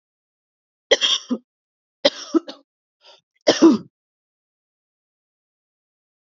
{
  "three_cough_length": "6.3 s",
  "three_cough_amplitude": 28585,
  "three_cough_signal_mean_std_ratio": 0.25,
  "survey_phase": "beta (2021-08-13 to 2022-03-07)",
  "age": "45-64",
  "gender": "Female",
  "wearing_mask": "No",
  "symptom_runny_or_blocked_nose": true,
  "symptom_sore_throat": true,
  "symptom_fatigue": true,
  "symptom_onset": "2 days",
  "smoker_status": "Ex-smoker",
  "respiratory_condition_asthma": false,
  "respiratory_condition_other": false,
  "recruitment_source": "Test and Trace",
  "submission_delay": "1 day",
  "covid_test_result": "Positive",
  "covid_test_method": "RT-qPCR",
  "covid_ct_value": 22.1,
  "covid_ct_gene": "ORF1ab gene",
  "covid_ct_mean": 22.6,
  "covid_viral_load": "40000 copies/ml",
  "covid_viral_load_category": "Low viral load (10K-1M copies/ml)"
}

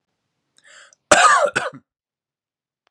{
  "cough_length": "2.9 s",
  "cough_amplitude": 32768,
  "cough_signal_mean_std_ratio": 0.32,
  "survey_phase": "beta (2021-08-13 to 2022-03-07)",
  "age": "18-44",
  "gender": "Male",
  "wearing_mask": "No",
  "symptom_none": true,
  "smoker_status": "Current smoker (1 to 10 cigarettes per day)",
  "respiratory_condition_asthma": false,
  "respiratory_condition_other": false,
  "recruitment_source": "REACT",
  "submission_delay": "1 day",
  "covid_test_result": "Negative",
  "covid_test_method": "RT-qPCR",
  "influenza_a_test_result": "Negative",
  "influenza_b_test_result": "Negative"
}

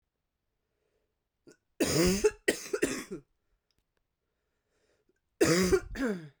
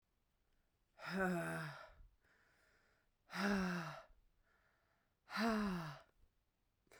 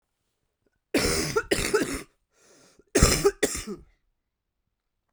{
  "three_cough_length": "6.4 s",
  "three_cough_amplitude": 8354,
  "three_cough_signal_mean_std_ratio": 0.38,
  "exhalation_length": "7.0 s",
  "exhalation_amplitude": 1584,
  "exhalation_signal_mean_std_ratio": 0.47,
  "cough_length": "5.1 s",
  "cough_amplitude": 20687,
  "cough_signal_mean_std_ratio": 0.4,
  "survey_phase": "beta (2021-08-13 to 2022-03-07)",
  "age": "18-44",
  "gender": "Female",
  "wearing_mask": "No",
  "symptom_cough_any": true,
  "symptom_runny_or_blocked_nose": true,
  "symptom_shortness_of_breath": true,
  "symptom_sore_throat": true,
  "symptom_fatigue": true,
  "symptom_headache": true,
  "symptom_change_to_sense_of_smell_or_taste": true,
  "symptom_loss_of_taste": true,
  "symptom_onset": "2 days",
  "smoker_status": "Current smoker (11 or more cigarettes per day)",
  "respiratory_condition_asthma": false,
  "respiratory_condition_other": false,
  "recruitment_source": "Test and Trace",
  "submission_delay": "2 days",
  "covid_test_result": "Positive",
  "covid_test_method": "RT-qPCR"
}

